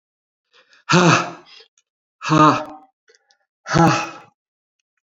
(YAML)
exhalation_length: 5.0 s
exhalation_amplitude: 30600
exhalation_signal_mean_std_ratio: 0.37
survey_phase: beta (2021-08-13 to 2022-03-07)
age: 65+
gender: Male
wearing_mask: 'No'
symptom_cough_any: true
symptom_runny_or_blocked_nose: true
symptom_diarrhoea: true
symptom_fatigue: true
symptom_fever_high_temperature: true
symptom_other: true
symptom_onset: 5 days
smoker_status: Never smoked
respiratory_condition_asthma: false
respiratory_condition_other: false
recruitment_source: Test and Trace
submission_delay: 2 days
covid_test_result: Positive
covid_test_method: RT-qPCR
covid_ct_value: 14.8
covid_ct_gene: ORF1ab gene
covid_ct_mean: 15.1
covid_viral_load: 11000000 copies/ml
covid_viral_load_category: High viral load (>1M copies/ml)